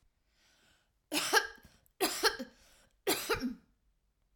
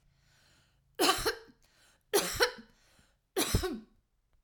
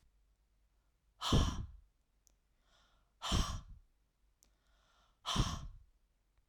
{"cough_length": "4.4 s", "cough_amplitude": 7084, "cough_signal_mean_std_ratio": 0.38, "three_cough_length": "4.4 s", "three_cough_amplitude": 10027, "three_cough_signal_mean_std_ratio": 0.38, "exhalation_length": "6.5 s", "exhalation_amplitude": 4046, "exhalation_signal_mean_std_ratio": 0.33, "survey_phase": "alpha (2021-03-01 to 2021-08-12)", "age": "45-64", "gender": "Female", "wearing_mask": "No", "symptom_none": true, "smoker_status": "Ex-smoker", "respiratory_condition_asthma": false, "respiratory_condition_other": false, "recruitment_source": "REACT", "submission_delay": "1 day", "covid_test_result": "Negative", "covid_test_method": "RT-qPCR"}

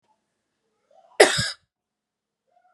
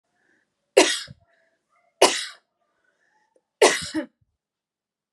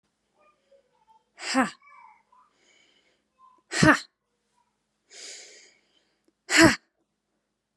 {"cough_length": "2.7 s", "cough_amplitude": 32767, "cough_signal_mean_std_ratio": 0.2, "three_cough_length": "5.1 s", "three_cough_amplitude": 32104, "three_cough_signal_mean_std_ratio": 0.26, "exhalation_length": "7.8 s", "exhalation_amplitude": 27116, "exhalation_signal_mean_std_ratio": 0.22, "survey_phase": "beta (2021-08-13 to 2022-03-07)", "age": "18-44", "gender": "Female", "wearing_mask": "No", "symptom_cough_any": true, "symptom_sore_throat": true, "symptom_fatigue": true, "symptom_other": true, "symptom_onset": "10 days", "smoker_status": "Ex-smoker", "respiratory_condition_asthma": true, "respiratory_condition_other": false, "recruitment_source": "REACT", "submission_delay": "0 days", "covid_test_result": "Negative", "covid_test_method": "RT-qPCR"}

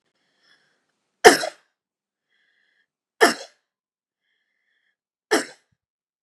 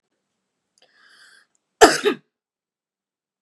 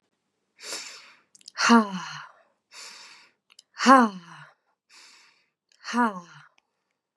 {"three_cough_length": "6.2 s", "three_cough_amplitude": 32768, "three_cough_signal_mean_std_ratio": 0.17, "cough_length": "3.4 s", "cough_amplitude": 32768, "cough_signal_mean_std_ratio": 0.19, "exhalation_length": "7.2 s", "exhalation_amplitude": 26919, "exhalation_signal_mean_std_ratio": 0.28, "survey_phase": "beta (2021-08-13 to 2022-03-07)", "age": "18-44", "gender": "Female", "wearing_mask": "No", "symptom_none": true, "smoker_status": "Never smoked", "respiratory_condition_asthma": false, "respiratory_condition_other": false, "recruitment_source": "REACT", "submission_delay": "1 day", "covid_test_result": "Negative", "covid_test_method": "RT-qPCR", "influenza_a_test_result": "Negative", "influenza_b_test_result": "Negative"}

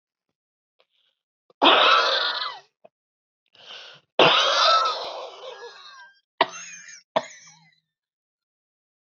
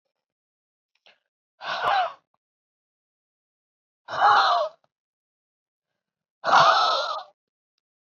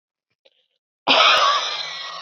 {"three_cough_length": "9.1 s", "three_cough_amplitude": 25277, "three_cough_signal_mean_std_ratio": 0.38, "exhalation_length": "8.1 s", "exhalation_amplitude": 19634, "exhalation_signal_mean_std_ratio": 0.36, "cough_length": "2.2 s", "cough_amplitude": 24527, "cough_signal_mean_std_ratio": 0.52, "survey_phase": "beta (2021-08-13 to 2022-03-07)", "age": "18-44", "gender": "Female", "wearing_mask": "No", "symptom_cough_any": true, "symptom_sore_throat": true, "symptom_fatigue": true, "symptom_change_to_sense_of_smell_or_taste": true, "symptom_loss_of_taste": true, "smoker_status": "Ex-smoker", "respiratory_condition_asthma": true, "respiratory_condition_other": false, "recruitment_source": "Test and Trace", "submission_delay": "2 days", "covid_test_method": "RT-qPCR", "covid_ct_value": 35.9, "covid_ct_gene": "ORF1ab gene"}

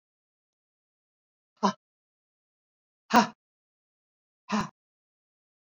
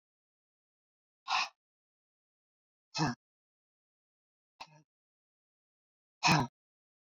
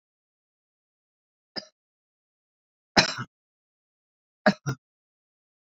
{"cough_length": "5.6 s", "cough_amplitude": 18417, "cough_signal_mean_std_ratio": 0.18, "exhalation_length": "7.2 s", "exhalation_amplitude": 6407, "exhalation_signal_mean_std_ratio": 0.22, "three_cough_length": "5.6 s", "three_cough_amplitude": 26223, "three_cough_signal_mean_std_ratio": 0.16, "survey_phase": "beta (2021-08-13 to 2022-03-07)", "age": "65+", "gender": "Female", "wearing_mask": "No", "symptom_shortness_of_breath": true, "smoker_status": "Ex-smoker", "respiratory_condition_asthma": false, "respiratory_condition_other": false, "recruitment_source": "REACT", "submission_delay": "2 days", "covid_test_result": "Negative", "covid_test_method": "RT-qPCR"}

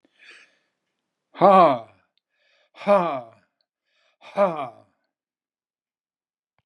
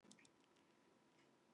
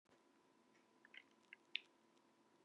{"exhalation_length": "6.7 s", "exhalation_amplitude": 24648, "exhalation_signal_mean_std_ratio": 0.28, "cough_length": "1.5 s", "cough_amplitude": 299, "cough_signal_mean_std_ratio": 0.93, "three_cough_length": "2.6 s", "three_cough_amplitude": 2566, "three_cough_signal_mean_std_ratio": 0.22, "survey_phase": "beta (2021-08-13 to 2022-03-07)", "age": "65+", "gender": "Male", "wearing_mask": "No", "symptom_none": true, "smoker_status": "Ex-smoker", "respiratory_condition_asthma": false, "respiratory_condition_other": false, "recruitment_source": "REACT", "submission_delay": "1 day", "covid_test_result": "Negative", "covid_test_method": "RT-qPCR", "influenza_a_test_result": "Negative", "influenza_b_test_result": "Negative"}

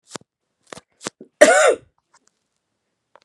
{"cough_length": "3.2 s", "cough_amplitude": 32768, "cough_signal_mean_std_ratio": 0.26, "survey_phase": "beta (2021-08-13 to 2022-03-07)", "age": "45-64", "gender": "Female", "wearing_mask": "No", "symptom_new_continuous_cough": true, "symptom_onset": "5 days", "smoker_status": "Never smoked", "respiratory_condition_asthma": false, "respiratory_condition_other": false, "recruitment_source": "Test and Trace", "submission_delay": "2 days", "covid_test_result": "Positive", "covid_test_method": "RT-qPCR", "covid_ct_value": 12.3, "covid_ct_gene": "ORF1ab gene", "covid_ct_mean": 12.7, "covid_viral_load": "68000000 copies/ml", "covid_viral_load_category": "High viral load (>1M copies/ml)"}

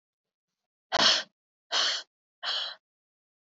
{"exhalation_length": "3.5 s", "exhalation_amplitude": 12847, "exhalation_signal_mean_std_ratio": 0.37, "survey_phase": "beta (2021-08-13 to 2022-03-07)", "age": "45-64", "gender": "Female", "wearing_mask": "No", "symptom_cough_any": true, "symptom_new_continuous_cough": true, "symptom_runny_or_blocked_nose": true, "symptom_shortness_of_breath": true, "symptom_sore_throat": true, "symptom_fatigue": true, "symptom_fever_high_temperature": true, "symptom_headache": true, "symptom_loss_of_taste": true, "symptom_other": true, "symptom_onset": "1 day", "smoker_status": "Never smoked", "respiratory_condition_asthma": false, "respiratory_condition_other": false, "recruitment_source": "Test and Trace", "submission_delay": "1 day", "covid_test_result": "Positive", "covid_test_method": "RT-qPCR", "covid_ct_value": 23.6, "covid_ct_gene": "ORF1ab gene"}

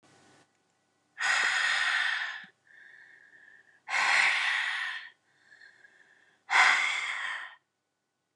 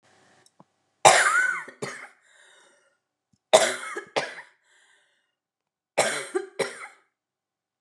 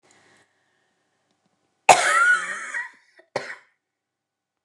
{"exhalation_length": "8.4 s", "exhalation_amplitude": 12629, "exhalation_signal_mean_std_ratio": 0.52, "three_cough_length": "7.8 s", "three_cough_amplitude": 29204, "three_cough_signal_mean_std_ratio": 0.31, "cough_length": "4.6 s", "cough_amplitude": 29204, "cough_signal_mean_std_ratio": 0.31, "survey_phase": "alpha (2021-03-01 to 2021-08-12)", "age": "65+", "gender": "Female", "wearing_mask": "No", "symptom_none": true, "smoker_status": "Never smoked", "respiratory_condition_asthma": false, "respiratory_condition_other": false, "recruitment_source": "REACT", "submission_delay": "1 day", "covid_test_result": "Negative", "covid_test_method": "RT-qPCR"}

